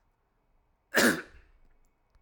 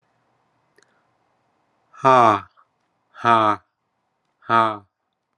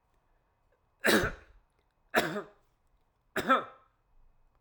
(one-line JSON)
{"cough_length": "2.2 s", "cough_amplitude": 11168, "cough_signal_mean_std_ratio": 0.28, "exhalation_length": "5.4 s", "exhalation_amplitude": 31472, "exhalation_signal_mean_std_ratio": 0.29, "three_cough_length": "4.6 s", "three_cough_amplitude": 11995, "three_cough_signal_mean_std_ratio": 0.32, "survey_phase": "alpha (2021-03-01 to 2021-08-12)", "age": "45-64", "gender": "Male", "wearing_mask": "No", "symptom_none": true, "symptom_onset": "8 days", "smoker_status": "Never smoked", "respiratory_condition_asthma": false, "respiratory_condition_other": false, "recruitment_source": "REACT", "submission_delay": "3 days", "covid_test_result": "Negative", "covid_test_method": "RT-qPCR"}